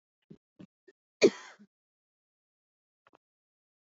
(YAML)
cough_length: 3.8 s
cough_amplitude: 11905
cough_signal_mean_std_ratio: 0.12
survey_phase: beta (2021-08-13 to 2022-03-07)
age: 18-44
gender: Female
wearing_mask: 'No'
symptom_none: true
smoker_status: Never smoked
respiratory_condition_asthma: true
respiratory_condition_other: false
recruitment_source: REACT
submission_delay: 1 day
covid_test_result: Negative
covid_test_method: RT-qPCR